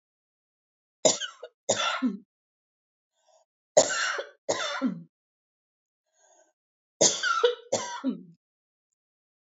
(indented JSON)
{
  "three_cough_length": "9.5 s",
  "three_cough_amplitude": 19902,
  "three_cough_signal_mean_std_ratio": 0.36,
  "survey_phase": "alpha (2021-03-01 to 2021-08-12)",
  "age": "65+",
  "gender": "Female",
  "wearing_mask": "No",
  "symptom_none": true,
  "smoker_status": "Ex-smoker",
  "respiratory_condition_asthma": false,
  "respiratory_condition_other": false,
  "recruitment_source": "REACT",
  "submission_delay": "2 days",
  "covid_test_result": "Negative",
  "covid_test_method": "RT-qPCR"
}